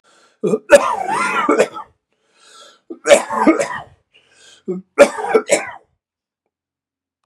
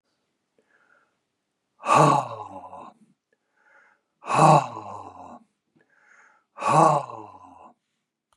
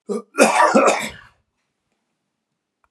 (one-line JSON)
{"three_cough_length": "7.3 s", "three_cough_amplitude": 32768, "three_cough_signal_mean_std_ratio": 0.4, "exhalation_length": "8.4 s", "exhalation_amplitude": 23485, "exhalation_signal_mean_std_ratio": 0.32, "cough_length": "2.9 s", "cough_amplitude": 32544, "cough_signal_mean_std_ratio": 0.4, "survey_phase": "beta (2021-08-13 to 2022-03-07)", "age": "65+", "gender": "Male", "wearing_mask": "No", "symptom_none": true, "smoker_status": "Never smoked", "respiratory_condition_asthma": false, "respiratory_condition_other": false, "recruitment_source": "REACT", "submission_delay": "1 day", "covid_test_result": "Negative", "covid_test_method": "RT-qPCR"}